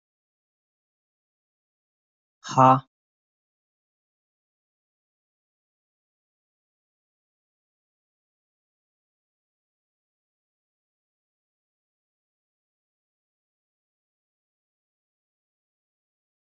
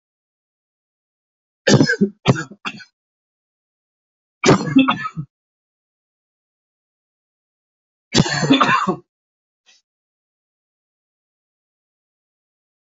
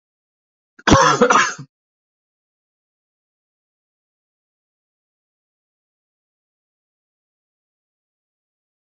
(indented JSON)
{
  "exhalation_length": "16.5 s",
  "exhalation_amplitude": 23299,
  "exhalation_signal_mean_std_ratio": 0.09,
  "three_cough_length": "13.0 s",
  "three_cough_amplitude": 32768,
  "three_cough_signal_mean_std_ratio": 0.28,
  "cough_length": "9.0 s",
  "cough_amplitude": 29654,
  "cough_signal_mean_std_ratio": 0.2,
  "survey_phase": "beta (2021-08-13 to 2022-03-07)",
  "age": "18-44",
  "gender": "Male",
  "wearing_mask": "Yes",
  "symptom_cough_any": true,
  "symptom_fatigue": true,
  "symptom_fever_high_temperature": true,
  "symptom_headache": true,
  "symptom_change_to_sense_of_smell_or_taste": true,
  "smoker_status": "Ex-smoker",
  "respiratory_condition_asthma": false,
  "respiratory_condition_other": false,
  "recruitment_source": "Test and Trace",
  "submission_delay": "1 day",
  "covid_test_result": "Positive",
  "covid_test_method": "ePCR"
}